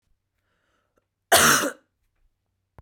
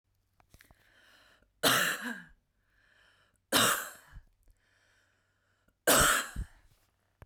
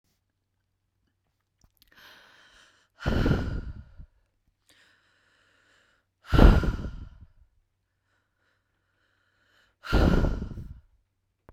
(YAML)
cough_length: 2.8 s
cough_amplitude: 29436
cough_signal_mean_std_ratio: 0.29
three_cough_length: 7.3 s
three_cough_amplitude: 11507
three_cough_signal_mean_std_ratio: 0.33
exhalation_length: 11.5 s
exhalation_amplitude: 31099
exhalation_signal_mean_std_ratio: 0.28
survey_phase: beta (2021-08-13 to 2022-03-07)
age: 18-44
gender: Female
wearing_mask: 'No'
symptom_none: true
smoker_status: Current smoker (1 to 10 cigarettes per day)
respiratory_condition_asthma: false
respiratory_condition_other: false
recruitment_source: REACT
submission_delay: 1 day
covid_test_result: Negative
covid_test_method: RT-qPCR